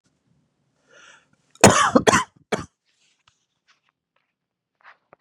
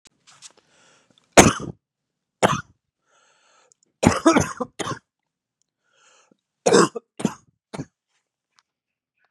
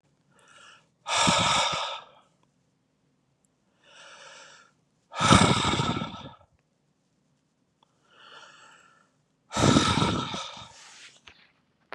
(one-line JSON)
{"cough_length": "5.2 s", "cough_amplitude": 32768, "cough_signal_mean_std_ratio": 0.23, "three_cough_length": "9.3 s", "three_cough_amplitude": 32768, "three_cough_signal_mean_std_ratio": 0.25, "exhalation_length": "11.9 s", "exhalation_amplitude": 25922, "exhalation_signal_mean_std_ratio": 0.38, "survey_phase": "beta (2021-08-13 to 2022-03-07)", "age": "18-44", "gender": "Male", "wearing_mask": "No", "symptom_cough_any": true, "symptom_new_continuous_cough": true, "symptom_shortness_of_breath": true, "symptom_diarrhoea": true, "symptom_headache": true, "symptom_onset": "5 days", "smoker_status": "Never smoked", "respiratory_condition_asthma": false, "respiratory_condition_other": false, "recruitment_source": "REACT", "submission_delay": "3 days", "covid_test_result": "Negative", "covid_test_method": "RT-qPCR", "influenza_a_test_result": "Negative", "influenza_b_test_result": "Negative"}